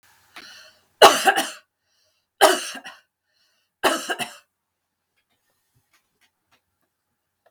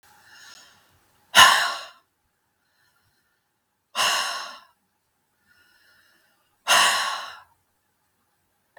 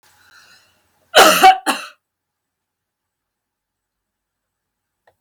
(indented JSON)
{
  "three_cough_length": "7.5 s",
  "three_cough_amplitude": 32768,
  "three_cough_signal_mean_std_ratio": 0.24,
  "exhalation_length": "8.8 s",
  "exhalation_amplitude": 32768,
  "exhalation_signal_mean_std_ratio": 0.28,
  "cough_length": "5.2 s",
  "cough_amplitude": 32768,
  "cough_signal_mean_std_ratio": 0.25,
  "survey_phase": "beta (2021-08-13 to 2022-03-07)",
  "age": "65+",
  "gender": "Female",
  "wearing_mask": "No",
  "symptom_none": true,
  "smoker_status": "Never smoked",
  "respiratory_condition_asthma": false,
  "respiratory_condition_other": false,
  "recruitment_source": "REACT",
  "submission_delay": "1 day",
  "covid_test_result": "Negative",
  "covid_test_method": "RT-qPCR"
}